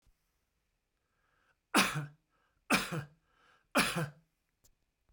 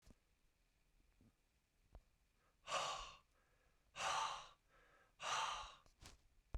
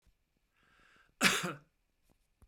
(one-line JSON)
{"three_cough_length": "5.1 s", "three_cough_amplitude": 8017, "three_cough_signal_mean_std_ratio": 0.31, "exhalation_length": "6.6 s", "exhalation_amplitude": 1013, "exhalation_signal_mean_std_ratio": 0.41, "cough_length": "2.5 s", "cough_amplitude": 8623, "cough_signal_mean_std_ratio": 0.27, "survey_phase": "beta (2021-08-13 to 2022-03-07)", "age": "65+", "gender": "Male", "wearing_mask": "No", "symptom_none": true, "smoker_status": "Never smoked", "respiratory_condition_asthma": false, "respiratory_condition_other": false, "recruitment_source": "REACT", "submission_delay": "1 day", "covid_test_result": "Negative", "covid_test_method": "RT-qPCR"}